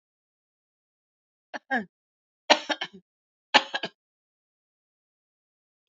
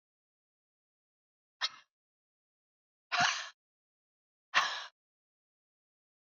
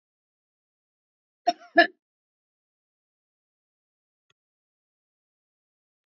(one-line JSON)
{"three_cough_length": "5.9 s", "three_cough_amplitude": 27012, "three_cough_signal_mean_std_ratio": 0.18, "exhalation_length": "6.2 s", "exhalation_amplitude": 6386, "exhalation_signal_mean_std_ratio": 0.24, "cough_length": "6.1 s", "cough_amplitude": 25475, "cough_signal_mean_std_ratio": 0.11, "survey_phase": "beta (2021-08-13 to 2022-03-07)", "age": "65+", "gender": "Female", "wearing_mask": "No", "symptom_none": true, "smoker_status": "Ex-smoker", "respiratory_condition_asthma": true, "respiratory_condition_other": false, "recruitment_source": "REACT", "submission_delay": "3 days", "covid_test_result": "Negative", "covid_test_method": "RT-qPCR", "influenza_a_test_result": "Unknown/Void", "influenza_b_test_result": "Unknown/Void"}